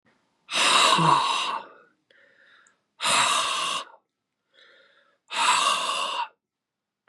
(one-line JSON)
{"exhalation_length": "7.1 s", "exhalation_amplitude": 15521, "exhalation_signal_mean_std_ratio": 0.53, "survey_phase": "beta (2021-08-13 to 2022-03-07)", "age": "45-64", "gender": "Male", "wearing_mask": "No", "symptom_cough_any": true, "symptom_runny_or_blocked_nose": true, "symptom_fatigue": true, "symptom_onset": "4 days", "smoker_status": "Ex-smoker", "respiratory_condition_asthma": false, "respiratory_condition_other": false, "recruitment_source": "Test and Trace", "submission_delay": "2 days", "covid_test_result": "Positive", "covid_test_method": "RT-qPCR"}